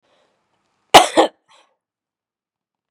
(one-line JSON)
{"cough_length": "2.9 s", "cough_amplitude": 32768, "cough_signal_mean_std_ratio": 0.2, "survey_phase": "beta (2021-08-13 to 2022-03-07)", "age": "45-64", "gender": "Female", "wearing_mask": "No", "symptom_none": true, "smoker_status": "Ex-smoker", "respiratory_condition_asthma": false, "respiratory_condition_other": false, "recruitment_source": "REACT", "submission_delay": "2 days", "covid_test_result": "Negative", "covid_test_method": "RT-qPCR", "influenza_a_test_result": "Unknown/Void", "influenza_b_test_result": "Unknown/Void"}